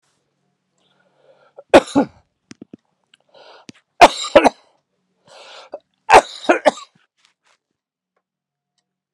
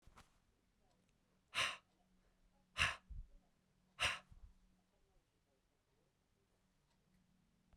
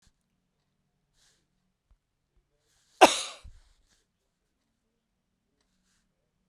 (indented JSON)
{
  "three_cough_length": "9.1 s",
  "three_cough_amplitude": 32768,
  "three_cough_signal_mean_std_ratio": 0.21,
  "exhalation_length": "7.8 s",
  "exhalation_amplitude": 2704,
  "exhalation_signal_mean_std_ratio": 0.25,
  "cough_length": "6.5 s",
  "cough_amplitude": 26341,
  "cough_signal_mean_std_ratio": 0.11,
  "survey_phase": "beta (2021-08-13 to 2022-03-07)",
  "age": "45-64",
  "gender": "Male",
  "wearing_mask": "No",
  "symptom_none": true,
  "smoker_status": "Never smoked",
  "respiratory_condition_asthma": false,
  "respiratory_condition_other": false,
  "recruitment_source": "REACT",
  "submission_delay": "1 day",
  "covid_test_result": "Negative",
  "covid_test_method": "RT-qPCR"
}